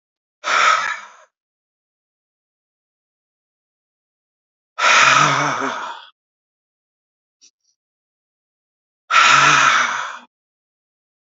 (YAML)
exhalation_length: 11.3 s
exhalation_amplitude: 29562
exhalation_signal_mean_std_ratio: 0.37
survey_phase: beta (2021-08-13 to 2022-03-07)
age: 65+
gender: Male
wearing_mask: 'No'
symptom_cough_any: true
symptom_shortness_of_breath: true
symptom_onset: 6 days
smoker_status: Never smoked
respiratory_condition_asthma: false
respiratory_condition_other: false
recruitment_source: Test and Trace
submission_delay: 2 days
covid_test_result: Positive
covid_test_method: RT-qPCR
covid_ct_value: 25.9
covid_ct_gene: N gene
covid_ct_mean: 26.0
covid_viral_load: 3000 copies/ml
covid_viral_load_category: Minimal viral load (< 10K copies/ml)